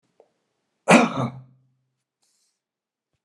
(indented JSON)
{
  "cough_length": "3.2 s",
  "cough_amplitude": 30481,
  "cough_signal_mean_std_ratio": 0.24,
  "survey_phase": "beta (2021-08-13 to 2022-03-07)",
  "age": "65+",
  "gender": "Male",
  "wearing_mask": "No",
  "symptom_cough_any": true,
  "symptom_sore_throat": true,
  "smoker_status": "Ex-smoker",
  "respiratory_condition_asthma": false,
  "respiratory_condition_other": false,
  "recruitment_source": "Test and Trace",
  "submission_delay": "1 day",
  "covid_test_result": "Positive",
  "covid_test_method": "RT-qPCR",
  "covid_ct_value": 18.2,
  "covid_ct_gene": "ORF1ab gene",
  "covid_ct_mean": 18.9,
  "covid_viral_load": "620000 copies/ml",
  "covid_viral_load_category": "Low viral load (10K-1M copies/ml)"
}